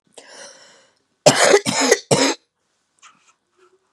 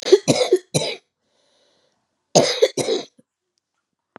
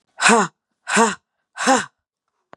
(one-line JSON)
{"cough_length": "3.9 s", "cough_amplitude": 32768, "cough_signal_mean_std_ratio": 0.37, "three_cough_length": "4.2 s", "three_cough_amplitude": 31781, "three_cough_signal_mean_std_ratio": 0.36, "exhalation_length": "2.6 s", "exhalation_amplitude": 30109, "exhalation_signal_mean_std_ratio": 0.42, "survey_phase": "beta (2021-08-13 to 2022-03-07)", "age": "45-64", "gender": "Female", "wearing_mask": "No", "symptom_cough_any": true, "symptom_loss_of_taste": true, "symptom_other": true, "symptom_onset": "3 days", "smoker_status": "Never smoked", "respiratory_condition_asthma": false, "respiratory_condition_other": false, "recruitment_source": "REACT", "submission_delay": "2 days", "covid_test_result": "Negative", "covid_test_method": "RT-qPCR", "influenza_a_test_result": "Negative", "influenza_b_test_result": "Negative"}